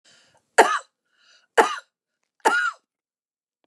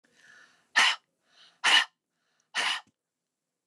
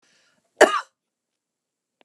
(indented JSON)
{
  "three_cough_length": "3.7 s",
  "three_cough_amplitude": 29204,
  "three_cough_signal_mean_std_ratio": 0.29,
  "exhalation_length": "3.7 s",
  "exhalation_amplitude": 12763,
  "exhalation_signal_mean_std_ratio": 0.32,
  "cough_length": "2.0 s",
  "cough_amplitude": 29204,
  "cough_signal_mean_std_ratio": 0.19,
  "survey_phase": "beta (2021-08-13 to 2022-03-07)",
  "age": "45-64",
  "gender": "Female",
  "wearing_mask": "No",
  "symptom_none": true,
  "smoker_status": "Never smoked",
  "respiratory_condition_asthma": false,
  "respiratory_condition_other": false,
  "recruitment_source": "REACT",
  "submission_delay": "3 days",
  "covid_test_result": "Negative",
  "covid_test_method": "RT-qPCR",
  "influenza_a_test_result": "Negative",
  "influenza_b_test_result": "Negative"
}